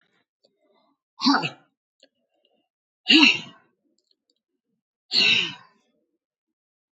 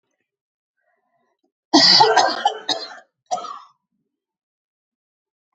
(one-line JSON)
{"exhalation_length": "7.0 s", "exhalation_amplitude": 25839, "exhalation_signal_mean_std_ratio": 0.28, "cough_length": "5.5 s", "cough_amplitude": 30338, "cough_signal_mean_std_ratio": 0.32, "survey_phase": "beta (2021-08-13 to 2022-03-07)", "age": "45-64", "gender": "Female", "wearing_mask": "No", "symptom_cough_any": true, "symptom_runny_or_blocked_nose": true, "symptom_headache": true, "smoker_status": "Never smoked", "respiratory_condition_asthma": false, "respiratory_condition_other": false, "recruitment_source": "Test and Trace", "submission_delay": "1 day", "covid_test_result": "Positive", "covid_test_method": "RT-qPCR", "covid_ct_value": 14.7, "covid_ct_gene": "ORF1ab gene", "covid_ct_mean": 15.2, "covid_viral_load": "10000000 copies/ml", "covid_viral_load_category": "High viral load (>1M copies/ml)"}